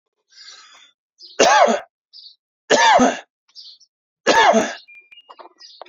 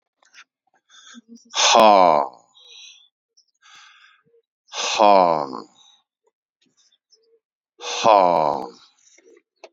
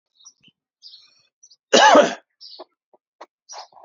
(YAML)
three_cough_length: 5.9 s
three_cough_amplitude: 30067
three_cough_signal_mean_std_ratio: 0.41
exhalation_length: 9.7 s
exhalation_amplitude: 28613
exhalation_signal_mean_std_ratio: 0.33
cough_length: 3.8 s
cough_amplitude: 27848
cough_signal_mean_std_ratio: 0.27
survey_phase: alpha (2021-03-01 to 2021-08-12)
age: 45-64
gender: Male
wearing_mask: 'No'
symptom_none: true
smoker_status: Ex-smoker
respiratory_condition_asthma: false
respiratory_condition_other: false
recruitment_source: REACT
submission_delay: 1 day
covid_test_result: Negative
covid_test_method: RT-qPCR